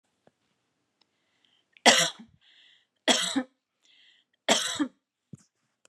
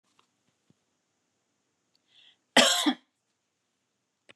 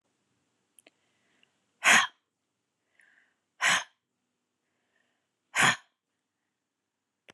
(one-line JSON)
{"three_cough_length": "5.9 s", "three_cough_amplitude": 27440, "three_cough_signal_mean_std_ratio": 0.28, "cough_length": "4.4 s", "cough_amplitude": 17797, "cough_signal_mean_std_ratio": 0.21, "exhalation_length": "7.3 s", "exhalation_amplitude": 13774, "exhalation_signal_mean_std_ratio": 0.22, "survey_phase": "beta (2021-08-13 to 2022-03-07)", "age": "18-44", "gender": "Female", "wearing_mask": "No", "symptom_cough_any": true, "symptom_runny_or_blocked_nose": true, "symptom_shortness_of_breath": true, "symptom_sore_throat": true, "symptom_fatigue": true, "symptom_fever_high_temperature": true, "symptom_headache": true, "symptom_change_to_sense_of_smell_or_taste": true, "symptom_loss_of_taste": true, "symptom_onset": "2 days", "smoker_status": "Never smoked", "respiratory_condition_asthma": false, "respiratory_condition_other": false, "recruitment_source": "Test and Trace", "submission_delay": "2 days", "covid_test_result": "Positive", "covid_test_method": "RT-qPCR", "covid_ct_value": 25.7, "covid_ct_gene": "ORF1ab gene", "covid_ct_mean": 26.2, "covid_viral_load": "2500 copies/ml", "covid_viral_load_category": "Minimal viral load (< 10K copies/ml)"}